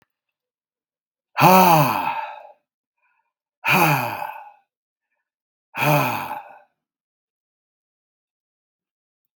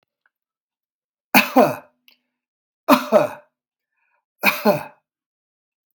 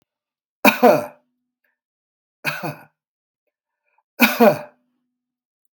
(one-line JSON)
{"exhalation_length": "9.4 s", "exhalation_amplitude": 32768, "exhalation_signal_mean_std_ratio": 0.34, "three_cough_length": "5.9 s", "three_cough_amplitude": 32768, "three_cough_signal_mean_std_ratio": 0.29, "cough_length": "5.8 s", "cough_amplitude": 32767, "cough_signal_mean_std_ratio": 0.27, "survey_phase": "beta (2021-08-13 to 2022-03-07)", "age": "65+", "gender": "Male", "wearing_mask": "No", "symptom_none": true, "smoker_status": "Current smoker (1 to 10 cigarettes per day)", "respiratory_condition_asthma": false, "respiratory_condition_other": false, "recruitment_source": "REACT", "submission_delay": "1 day", "covid_test_result": "Negative", "covid_test_method": "RT-qPCR", "influenza_a_test_result": "Negative", "influenza_b_test_result": "Negative"}